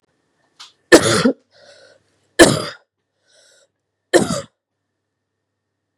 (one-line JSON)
{"three_cough_length": "6.0 s", "three_cough_amplitude": 32768, "three_cough_signal_mean_std_ratio": 0.26, "survey_phase": "beta (2021-08-13 to 2022-03-07)", "age": "18-44", "gender": "Female", "wearing_mask": "No", "symptom_none": true, "symptom_onset": "3 days", "smoker_status": "Never smoked", "respiratory_condition_asthma": false, "respiratory_condition_other": false, "recruitment_source": "Test and Trace", "submission_delay": "2 days", "covid_test_result": "Positive", "covid_test_method": "RT-qPCR", "covid_ct_value": 19.3, "covid_ct_gene": "ORF1ab gene", "covid_ct_mean": 19.8, "covid_viral_load": "330000 copies/ml", "covid_viral_load_category": "Low viral load (10K-1M copies/ml)"}